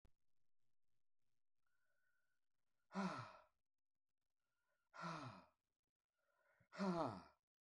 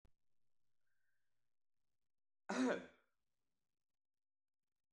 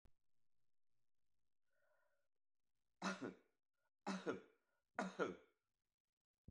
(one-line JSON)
{"exhalation_length": "7.6 s", "exhalation_amplitude": 898, "exhalation_signal_mean_std_ratio": 0.33, "cough_length": "4.9 s", "cough_amplitude": 1480, "cough_signal_mean_std_ratio": 0.23, "three_cough_length": "6.5 s", "three_cough_amplitude": 1437, "three_cough_signal_mean_std_ratio": 0.31, "survey_phase": "beta (2021-08-13 to 2022-03-07)", "age": "65+", "gender": "Male", "wearing_mask": "No", "symptom_none": true, "smoker_status": "Ex-smoker", "respiratory_condition_asthma": false, "respiratory_condition_other": false, "recruitment_source": "REACT", "submission_delay": "2 days", "covid_test_result": "Negative", "covid_test_method": "RT-qPCR", "influenza_a_test_result": "Negative", "influenza_b_test_result": "Negative"}